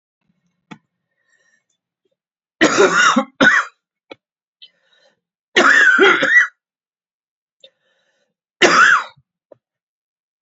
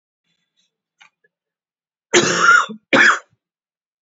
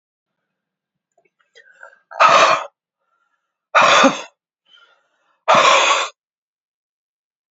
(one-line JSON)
{"three_cough_length": "10.4 s", "three_cough_amplitude": 30567, "three_cough_signal_mean_std_ratio": 0.38, "cough_length": "4.0 s", "cough_amplitude": 31066, "cough_signal_mean_std_ratio": 0.36, "exhalation_length": "7.5 s", "exhalation_amplitude": 32767, "exhalation_signal_mean_std_ratio": 0.36, "survey_phase": "beta (2021-08-13 to 2022-03-07)", "age": "45-64", "gender": "Male", "wearing_mask": "No", "symptom_new_continuous_cough": true, "symptom_fatigue": true, "symptom_onset": "3 days", "smoker_status": "Never smoked", "respiratory_condition_asthma": false, "respiratory_condition_other": false, "recruitment_source": "Test and Trace", "submission_delay": "2 days", "covid_test_result": "Positive", "covid_test_method": "RT-qPCR", "covid_ct_value": 12.6, "covid_ct_gene": "S gene"}